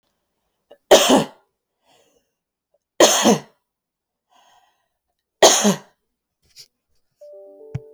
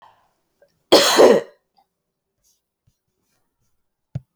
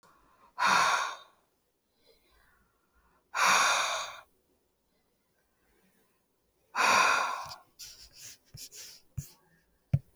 {"three_cough_length": "7.9 s", "three_cough_amplitude": 32706, "three_cough_signal_mean_std_ratio": 0.28, "cough_length": "4.4 s", "cough_amplitude": 32768, "cough_signal_mean_std_ratio": 0.27, "exhalation_length": "10.2 s", "exhalation_amplitude": 8539, "exhalation_signal_mean_std_ratio": 0.38, "survey_phase": "beta (2021-08-13 to 2022-03-07)", "age": "45-64", "gender": "Female", "wearing_mask": "No", "symptom_none": true, "smoker_status": "Ex-smoker", "respiratory_condition_asthma": false, "respiratory_condition_other": false, "recruitment_source": "REACT", "submission_delay": "7 days", "covid_test_result": "Negative", "covid_test_method": "RT-qPCR"}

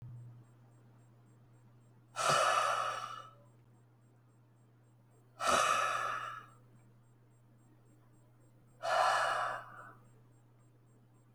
{"exhalation_length": "11.3 s", "exhalation_amplitude": 4809, "exhalation_signal_mean_std_ratio": 0.45, "survey_phase": "alpha (2021-03-01 to 2021-08-12)", "age": "65+", "gender": "Male", "wearing_mask": "No", "symptom_none": true, "smoker_status": "Ex-smoker", "respiratory_condition_asthma": false, "respiratory_condition_other": false, "recruitment_source": "REACT", "submission_delay": "1 day", "covid_test_result": "Negative", "covid_test_method": "RT-qPCR"}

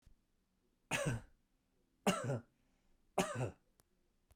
{"three_cough_length": "4.4 s", "three_cough_amplitude": 3603, "three_cough_signal_mean_std_ratio": 0.37, "survey_phase": "beta (2021-08-13 to 2022-03-07)", "age": "45-64", "gender": "Male", "wearing_mask": "No", "symptom_none": true, "symptom_onset": "13 days", "smoker_status": "Ex-smoker", "respiratory_condition_asthma": true, "respiratory_condition_other": false, "recruitment_source": "REACT", "submission_delay": "2 days", "covid_test_result": "Negative", "covid_test_method": "RT-qPCR"}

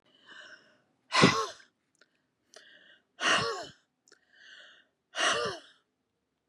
{"exhalation_length": "6.5 s", "exhalation_amplitude": 15557, "exhalation_signal_mean_std_ratio": 0.33, "survey_phase": "beta (2021-08-13 to 2022-03-07)", "age": "65+", "gender": "Female", "wearing_mask": "No", "symptom_none": true, "smoker_status": "Never smoked", "respiratory_condition_asthma": false, "respiratory_condition_other": false, "recruitment_source": "REACT", "submission_delay": "2 days", "covid_test_result": "Negative", "covid_test_method": "RT-qPCR", "influenza_a_test_result": "Negative", "influenza_b_test_result": "Negative"}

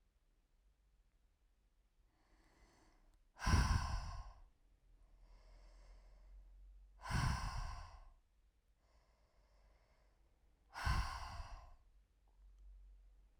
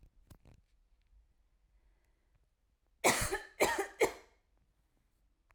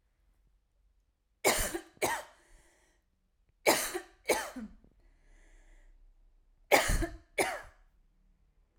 {"exhalation_length": "13.4 s", "exhalation_amplitude": 2788, "exhalation_signal_mean_std_ratio": 0.36, "cough_length": "5.5 s", "cough_amplitude": 7197, "cough_signal_mean_std_ratio": 0.28, "three_cough_length": "8.8 s", "three_cough_amplitude": 13320, "three_cough_signal_mean_std_ratio": 0.34, "survey_phase": "alpha (2021-03-01 to 2021-08-12)", "age": "18-44", "gender": "Female", "wearing_mask": "No", "symptom_none": true, "symptom_onset": "8 days", "smoker_status": "Never smoked", "respiratory_condition_asthma": false, "respiratory_condition_other": false, "recruitment_source": "REACT", "submission_delay": "2 days", "covid_test_result": "Negative", "covid_test_method": "RT-qPCR"}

